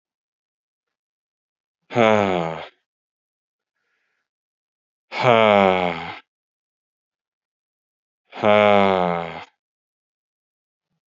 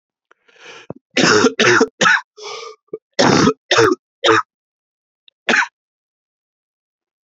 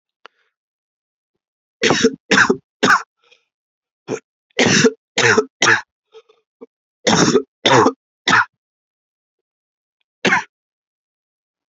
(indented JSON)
{
  "exhalation_length": "11.1 s",
  "exhalation_amplitude": 32767,
  "exhalation_signal_mean_std_ratio": 0.31,
  "cough_length": "7.3 s",
  "cough_amplitude": 32767,
  "cough_signal_mean_std_ratio": 0.42,
  "three_cough_length": "11.8 s",
  "three_cough_amplitude": 31324,
  "three_cough_signal_mean_std_ratio": 0.37,
  "survey_phase": "beta (2021-08-13 to 2022-03-07)",
  "age": "18-44",
  "gender": "Male",
  "wearing_mask": "No",
  "symptom_cough_any": true,
  "symptom_fatigue": true,
  "symptom_headache": true,
  "symptom_onset": "3 days",
  "smoker_status": "Never smoked",
  "respiratory_condition_asthma": false,
  "respiratory_condition_other": false,
  "recruitment_source": "Test and Trace",
  "submission_delay": "1 day",
  "covid_test_result": "Positive",
  "covid_test_method": "RT-qPCR",
  "covid_ct_value": 19.0,
  "covid_ct_gene": "N gene"
}